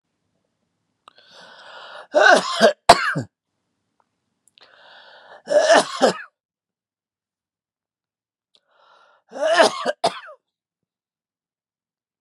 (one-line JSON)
{"three_cough_length": "12.2 s", "three_cough_amplitude": 32768, "three_cough_signal_mean_std_ratio": 0.29, "survey_phase": "beta (2021-08-13 to 2022-03-07)", "age": "65+", "gender": "Male", "wearing_mask": "No", "symptom_none": true, "smoker_status": "Never smoked", "respiratory_condition_asthma": false, "respiratory_condition_other": false, "recruitment_source": "REACT", "submission_delay": "2 days", "covid_test_result": "Negative", "covid_test_method": "RT-qPCR"}